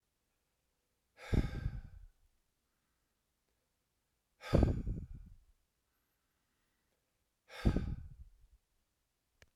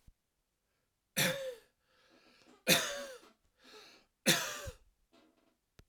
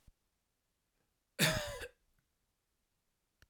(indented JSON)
{
  "exhalation_length": "9.6 s",
  "exhalation_amplitude": 6546,
  "exhalation_signal_mean_std_ratio": 0.28,
  "three_cough_length": "5.9 s",
  "three_cough_amplitude": 8517,
  "three_cough_signal_mean_std_ratio": 0.32,
  "cough_length": "3.5 s",
  "cough_amplitude": 4954,
  "cough_signal_mean_std_ratio": 0.25,
  "survey_phase": "alpha (2021-03-01 to 2021-08-12)",
  "age": "65+",
  "gender": "Male",
  "wearing_mask": "No",
  "symptom_none": true,
  "smoker_status": "Never smoked",
  "respiratory_condition_asthma": false,
  "respiratory_condition_other": false,
  "recruitment_source": "REACT",
  "submission_delay": "3 days",
  "covid_test_result": "Negative",
  "covid_test_method": "RT-qPCR"
}